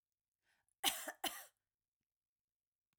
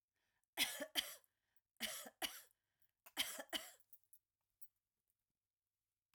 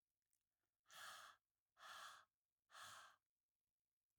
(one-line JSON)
{"cough_length": "3.0 s", "cough_amplitude": 3039, "cough_signal_mean_std_ratio": 0.24, "three_cough_length": "6.1 s", "three_cough_amplitude": 2183, "three_cough_signal_mean_std_ratio": 0.31, "exhalation_length": "4.2 s", "exhalation_amplitude": 173, "exhalation_signal_mean_std_ratio": 0.47, "survey_phase": "alpha (2021-03-01 to 2021-08-12)", "age": "45-64", "gender": "Female", "wearing_mask": "Yes", "symptom_none": true, "smoker_status": "Ex-smoker", "respiratory_condition_asthma": true, "respiratory_condition_other": false, "recruitment_source": "REACT", "submission_delay": "3 days", "covid_test_result": "Negative", "covid_test_method": "RT-qPCR"}